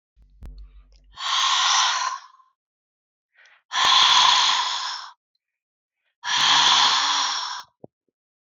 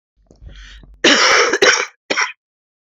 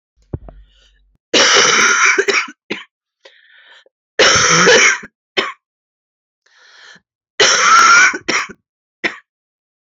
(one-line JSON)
{"exhalation_length": "8.5 s", "exhalation_amplitude": 23738, "exhalation_signal_mean_std_ratio": 0.55, "cough_length": "2.9 s", "cough_amplitude": 32767, "cough_signal_mean_std_ratio": 0.49, "three_cough_length": "9.8 s", "three_cough_amplitude": 32767, "three_cough_signal_mean_std_ratio": 0.49, "survey_phase": "beta (2021-08-13 to 2022-03-07)", "age": "18-44", "gender": "Female", "wearing_mask": "No", "symptom_cough_any": true, "symptom_shortness_of_breath": true, "symptom_sore_throat": true, "symptom_fatigue": true, "symptom_headache": true, "symptom_change_to_sense_of_smell_or_taste": true, "symptom_other": true, "symptom_onset": "3 days", "smoker_status": "Never smoked", "respiratory_condition_asthma": true, "respiratory_condition_other": false, "recruitment_source": "Test and Trace", "submission_delay": "2 days", "covid_test_result": "Positive", "covid_test_method": "RT-qPCR", "covid_ct_value": 26.3, "covid_ct_gene": "N gene"}